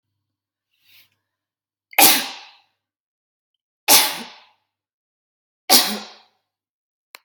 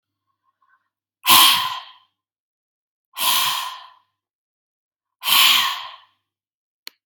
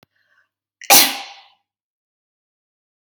{"three_cough_length": "7.2 s", "three_cough_amplitude": 32768, "three_cough_signal_mean_std_ratio": 0.25, "exhalation_length": "7.1 s", "exhalation_amplitude": 32768, "exhalation_signal_mean_std_ratio": 0.35, "cough_length": "3.2 s", "cough_amplitude": 32768, "cough_signal_mean_std_ratio": 0.22, "survey_phase": "beta (2021-08-13 to 2022-03-07)", "age": "45-64", "gender": "Female", "wearing_mask": "No", "symptom_runny_or_blocked_nose": true, "symptom_fatigue": true, "symptom_onset": "12 days", "smoker_status": "Ex-smoker", "respiratory_condition_asthma": false, "respiratory_condition_other": false, "recruitment_source": "REACT", "submission_delay": "2 days", "covid_test_result": "Negative", "covid_test_method": "RT-qPCR", "influenza_a_test_result": "Unknown/Void", "influenza_b_test_result": "Unknown/Void"}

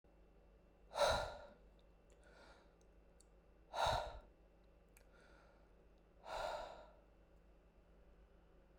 {"exhalation_length": "8.8 s", "exhalation_amplitude": 2156, "exhalation_signal_mean_std_ratio": 0.37, "survey_phase": "beta (2021-08-13 to 2022-03-07)", "age": "18-44", "gender": "Male", "wearing_mask": "No", "symptom_none": true, "smoker_status": "Never smoked", "respiratory_condition_asthma": false, "respiratory_condition_other": false, "recruitment_source": "REACT", "submission_delay": "2 days", "covid_test_result": "Negative", "covid_test_method": "RT-qPCR"}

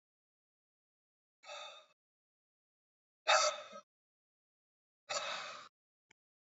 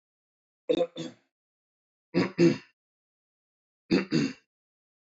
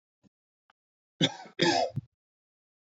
{"exhalation_length": "6.5 s", "exhalation_amplitude": 5256, "exhalation_signal_mean_std_ratio": 0.25, "three_cough_length": "5.1 s", "three_cough_amplitude": 10225, "three_cough_signal_mean_std_ratio": 0.32, "cough_length": "2.9 s", "cough_amplitude": 10731, "cough_signal_mean_std_ratio": 0.31, "survey_phase": "beta (2021-08-13 to 2022-03-07)", "age": "18-44", "gender": "Male", "wearing_mask": "No", "symptom_none": true, "smoker_status": "Never smoked", "respiratory_condition_asthma": false, "respiratory_condition_other": false, "recruitment_source": "REACT", "submission_delay": "2 days", "covid_test_result": "Negative", "covid_test_method": "RT-qPCR", "influenza_a_test_result": "Negative", "influenza_b_test_result": "Negative"}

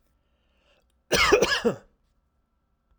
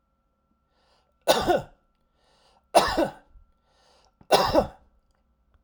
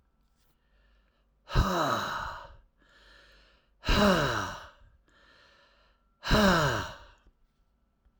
{"cough_length": "3.0 s", "cough_amplitude": 15064, "cough_signal_mean_std_ratio": 0.35, "three_cough_length": "5.6 s", "three_cough_amplitude": 23891, "three_cough_signal_mean_std_ratio": 0.32, "exhalation_length": "8.2 s", "exhalation_amplitude": 9339, "exhalation_signal_mean_std_ratio": 0.4, "survey_phase": "alpha (2021-03-01 to 2021-08-12)", "age": "65+", "gender": "Male", "wearing_mask": "No", "symptom_none": true, "smoker_status": "Never smoked", "respiratory_condition_asthma": false, "respiratory_condition_other": false, "recruitment_source": "REACT", "submission_delay": "1 day", "covid_test_result": "Negative", "covid_test_method": "RT-qPCR"}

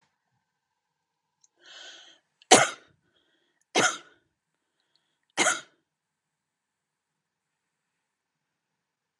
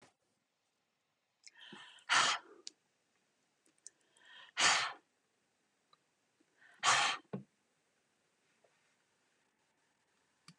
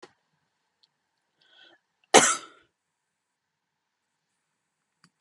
{"three_cough_length": "9.2 s", "three_cough_amplitude": 28479, "three_cough_signal_mean_std_ratio": 0.18, "exhalation_length": "10.6 s", "exhalation_amplitude": 5811, "exhalation_signal_mean_std_ratio": 0.26, "cough_length": "5.2 s", "cough_amplitude": 31389, "cough_signal_mean_std_ratio": 0.15, "survey_phase": "beta (2021-08-13 to 2022-03-07)", "age": "65+", "gender": "Female", "wearing_mask": "No", "symptom_none": true, "smoker_status": "Never smoked", "respiratory_condition_asthma": false, "respiratory_condition_other": false, "recruitment_source": "REACT", "submission_delay": "1 day", "covid_test_result": "Negative", "covid_test_method": "RT-qPCR"}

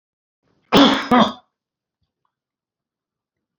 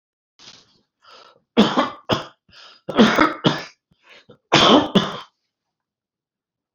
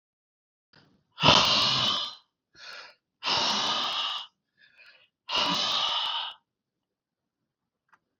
{"cough_length": "3.6 s", "cough_amplitude": 27870, "cough_signal_mean_std_ratio": 0.29, "three_cough_length": "6.7 s", "three_cough_amplitude": 30439, "three_cough_signal_mean_std_ratio": 0.36, "exhalation_length": "8.2 s", "exhalation_amplitude": 21197, "exhalation_signal_mean_std_ratio": 0.48, "survey_phase": "beta (2021-08-13 to 2022-03-07)", "age": "65+", "gender": "Male", "wearing_mask": "No", "symptom_none": true, "smoker_status": "Never smoked", "respiratory_condition_asthma": false, "respiratory_condition_other": false, "recruitment_source": "REACT", "submission_delay": "2 days", "covid_test_method": "RT-qPCR"}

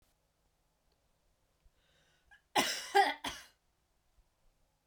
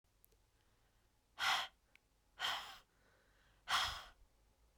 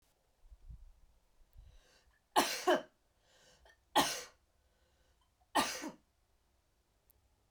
{"cough_length": "4.9 s", "cough_amplitude": 5904, "cough_signal_mean_std_ratio": 0.25, "exhalation_length": "4.8 s", "exhalation_amplitude": 2277, "exhalation_signal_mean_std_ratio": 0.36, "three_cough_length": "7.5 s", "three_cough_amplitude": 5869, "three_cough_signal_mean_std_ratio": 0.28, "survey_phase": "beta (2021-08-13 to 2022-03-07)", "age": "18-44", "gender": "Female", "wearing_mask": "No", "symptom_cough_any": true, "symptom_runny_or_blocked_nose": true, "symptom_change_to_sense_of_smell_or_taste": true, "symptom_loss_of_taste": true, "smoker_status": "Never smoked", "respiratory_condition_asthma": false, "respiratory_condition_other": false, "recruitment_source": "Test and Trace", "submission_delay": "2 days", "covid_test_result": "Positive", "covid_test_method": "RT-qPCR", "covid_ct_value": 16.9, "covid_ct_gene": "ORF1ab gene", "covid_ct_mean": 17.4, "covid_viral_load": "2000000 copies/ml", "covid_viral_load_category": "High viral load (>1M copies/ml)"}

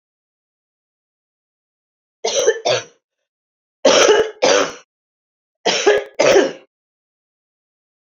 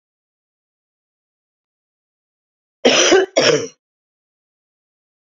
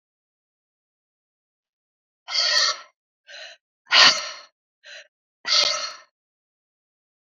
{"three_cough_length": "8.0 s", "three_cough_amplitude": 29759, "three_cough_signal_mean_std_ratio": 0.38, "cough_length": "5.4 s", "cough_amplitude": 32768, "cough_signal_mean_std_ratio": 0.28, "exhalation_length": "7.3 s", "exhalation_amplitude": 32768, "exhalation_signal_mean_std_ratio": 0.3, "survey_phase": "beta (2021-08-13 to 2022-03-07)", "age": "45-64", "gender": "Female", "wearing_mask": "No", "symptom_cough_any": true, "symptom_runny_or_blocked_nose": true, "symptom_sore_throat": true, "symptom_abdominal_pain": true, "symptom_fatigue": true, "symptom_headache": true, "symptom_onset": "3 days", "smoker_status": "Ex-smoker", "respiratory_condition_asthma": false, "respiratory_condition_other": false, "recruitment_source": "Test and Trace", "submission_delay": "2 days", "covid_test_result": "Positive", "covid_test_method": "RT-qPCR"}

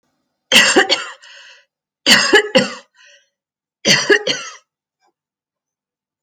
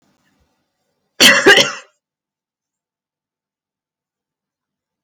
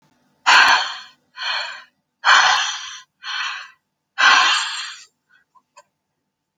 {"three_cough_length": "6.2 s", "three_cough_amplitude": 32768, "three_cough_signal_mean_std_ratio": 0.38, "cough_length": "5.0 s", "cough_amplitude": 32768, "cough_signal_mean_std_ratio": 0.24, "exhalation_length": "6.6 s", "exhalation_amplitude": 32768, "exhalation_signal_mean_std_ratio": 0.44, "survey_phase": "alpha (2021-03-01 to 2021-08-12)", "age": "45-64", "gender": "Female", "wearing_mask": "No", "symptom_none": true, "smoker_status": "Never smoked", "respiratory_condition_asthma": false, "respiratory_condition_other": false, "recruitment_source": "REACT", "submission_delay": "1 day", "covid_test_result": "Negative", "covid_test_method": "RT-qPCR"}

